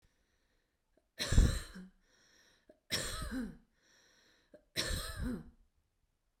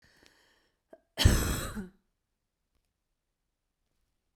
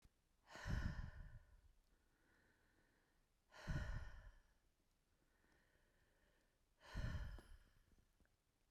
three_cough_length: 6.4 s
three_cough_amplitude: 6536
three_cough_signal_mean_std_ratio: 0.33
cough_length: 4.4 s
cough_amplitude: 13667
cough_signal_mean_std_ratio: 0.25
exhalation_length: 8.7 s
exhalation_amplitude: 819
exhalation_signal_mean_std_ratio: 0.41
survey_phase: beta (2021-08-13 to 2022-03-07)
age: 45-64
gender: Female
wearing_mask: 'No'
symptom_runny_or_blocked_nose: true
smoker_status: Never smoked
respiratory_condition_asthma: false
respiratory_condition_other: false
recruitment_source: Test and Trace
submission_delay: 1 day
covid_test_result: Positive
covid_test_method: RT-qPCR
covid_ct_value: 27.3
covid_ct_gene: ORF1ab gene
covid_ct_mean: 28.2
covid_viral_load: 560 copies/ml
covid_viral_load_category: Minimal viral load (< 10K copies/ml)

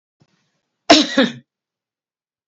cough_length: 2.5 s
cough_amplitude: 31087
cough_signal_mean_std_ratio: 0.27
survey_phase: beta (2021-08-13 to 2022-03-07)
age: 45-64
gender: Female
wearing_mask: 'No'
symptom_fatigue: true
smoker_status: Never smoked
respiratory_condition_asthma: false
respiratory_condition_other: false
recruitment_source: REACT
submission_delay: 3 days
covid_test_result: Negative
covid_test_method: RT-qPCR
influenza_a_test_result: Negative
influenza_b_test_result: Negative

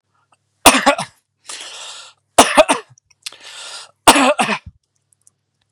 three_cough_length: 5.7 s
three_cough_amplitude: 32768
three_cough_signal_mean_std_ratio: 0.34
survey_phase: beta (2021-08-13 to 2022-03-07)
age: 45-64
gender: Male
wearing_mask: 'No'
symptom_shortness_of_breath: true
symptom_fatigue: true
smoker_status: Ex-smoker
respiratory_condition_asthma: false
respiratory_condition_other: false
recruitment_source: REACT
submission_delay: 11 days
covid_test_result: Negative
covid_test_method: RT-qPCR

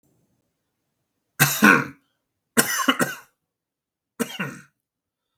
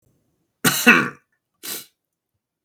three_cough_length: 5.4 s
three_cough_amplitude: 32293
three_cough_signal_mean_std_ratio: 0.3
cough_length: 2.6 s
cough_amplitude: 32768
cough_signal_mean_std_ratio: 0.3
survey_phase: beta (2021-08-13 to 2022-03-07)
age: 18-44
gender: Male
wearing_mask: 'No'
symptom_none: true
symptom_onset: 13 days
smoker_status: Never smoked
respiratory_condition_asthma: false
respiratory_condition_other: false
recruitment_source: REACT
submission_delay: 8 days
covid_test_result: Negative
covid_test_method: RT-qPCR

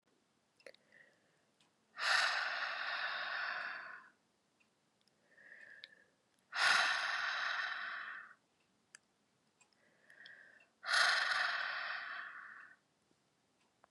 exhalation_length: 13.9 s
exhalation_amplitude: 4867
exhalation_signal_mean_std_ratio: 0.48
survey_phase: beta (2021-08-13 to 2022-03-07)
age: 18-44
gender: Female
wearing_mask: 'No'
symptom_cough_any: true
symptom_runny_or_blocked_nose: true
symptom_sore_throat: true
symptom_change_to_sense_of_smell_or_taste: true
symptom_loss_of_taste: true
symptom_onset: 2 days
smoker_status: Never smoked
respiratory_condition_asthma: false
respiratory_condition_other: false
recruitment_source: Test and Trace
submission_delay: 1 day
covid_test_result: Positive
covid_test_method: RT-qPCR
covid_ct_value: 18.1
covid_ct_gene: ORF1ab gene
covid_ct_mean: 18.3
covid_viral_load: 970000 copies/ml
covid_viral_load_category: Low viral load (10K-1M copies/ml)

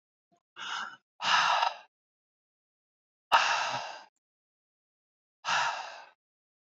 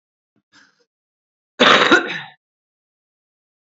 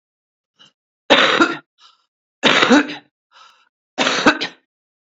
exhalation_length: 6.7 s
exhalation_amplitude: 10130
exhalation_signal_mean_std_ratio: 0.39
cough_length: 3.7 s
cough_amplitude: 32327
cough_signal_mean_std_ratio: 0.28
three_cough_length: 5.0 s
three_cough_amplitude: 30831
three_cough_signal_mean_std_ratio: 0.39
survey_phase: beta (2021-08-13 to 2022-03-07)
age: 45-64
gender: Female
wearing_mask: 'No'
symptom_none: true
smoker_status: Current smoker (11 or more cigarettes per day)
respiratory_condition_asthma: false
respiratory_condition_other: false
recruitment_source: REACT
submission_delay: 0 days
covid_test_result: Negative
covid_test_method: RT-qPCR
influenza_a_test_result: Negative
influenza_b_test_result: Negative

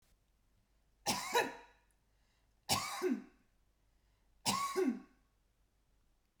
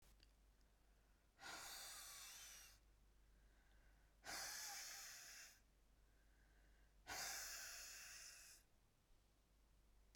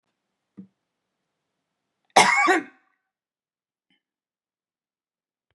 three_cough_length: 6.4 s
three_cough_amplitude: 3677
three_cough_signal_mean_std_ratio: 0.39
exhalation_length: 10.2 s
exhalation_amplitude: 404
exhalation_signal_mean_std_ratio: 0.66
cough_length: 5.5 s
cough_amplitude: 28492
cough_signal_mean_std_ratio: 0.22
survey_phase: beta (2021-08-13 to 2022-03-07)
age: 65+
gender: Female
wearing_mask: 'No'
symptom_none: true
smoker_status: Ex-smoker
respiratory_condition_asthma: false
respiratory_condition_other: false
recruitment_source: REACT
submission_delay: 1 day
covid_test_result: Negative
covid_test_method: RT-qPCR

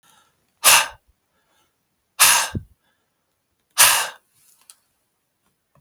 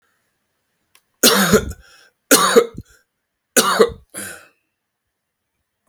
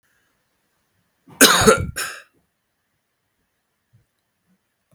exhalation_length: 5.8 s
exhalation_amplitude: 32768
exhalation_signal_mean_std_ratio: 0.29
three_cough_length: 5.9 s
three_cough_amplitude: 32768
three_cough_signal_mean_std_ratio: 0.34
cough_length: 4.9 s
cough_amplitude: 32768
cough_signal_mean_std_ratio: 0.24
survey_phase: beta (2021-08-13 to 2022-03-07)
age: 45-64
gender: Male
wearing_mask: 'No'
symptom_none: true
smoker_status: Ex-smoker
respiratory_condition_asthma: false
respiratory_condition_other: false
recruitment_source: REACT
submission_delay: 2 days
covid_test_result: Negative
covid_test_method: RT-qPCR
influenza_a_test_result: Negative
influenza_b_test_result: Negative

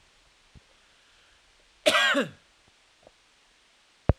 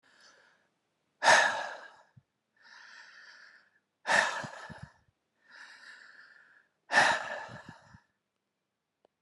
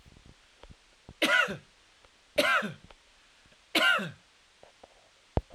cough_length: 4.2 s
cough_amplitude: 20188
cough_signal_mean_std_ratio: 0.27
exhalation_length: 9.2 s
exhalation_amplitude: 12986
exhalation_signal_mean_std_ratio: 0.3
three_cough_length: 5.5 s
three_cough_amplitude: 11398
three_cough_signal_mean_std_ratio: 0.36
survey_phase: alpha (2021-03-01 to 2021-08-12)
age: 45-64
gender: Male
wearing_mask: 'No'
symptom_none: true
smoker_status: Current smoker (e-cigarettes or vapes only)
respiratory_condition_asthma: false
respiratory_condition_other: false
recruitment_source: REACT
submission_delay: 2 days
covid_test_result: Negative
covid_test_method: RT-qPCR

